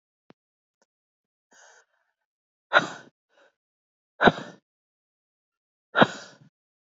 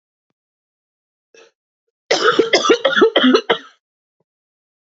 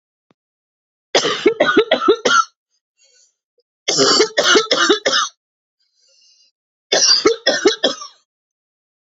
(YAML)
exhalation_length: 7.0 s
exhalation_amplitude: 26850
exhalation_signal_mean_std_ratio: 0.17
cough_length: 4.9 s
cough_amplitude: 28860
cough_signal_mean_std_ratio: 0.39
three_cough_length: 9.0 s
three_cough_amplitude: 32768
three_cough_signal_mean_std_ratio: 0.47
survey_phase: beta (2021-08-13 to 2022-03-07)
age: 18-44
gender: Female
wearing_mask: 'No'
symptom_cough_any: true
symptom_sore_throat: true
symptom_diarrhoea: true
symptom_fatigue: true
smoker_status: Never smoked
respiratory_condition_asthma: true
respiratory_condition_other: false
recruitment_source: REACT
submission_delay: 1 day
covid_test_result: Negative
covid_test_method: RT-qPCR
influenza_a_test_result: Negative
influenza_b_test_result: Negative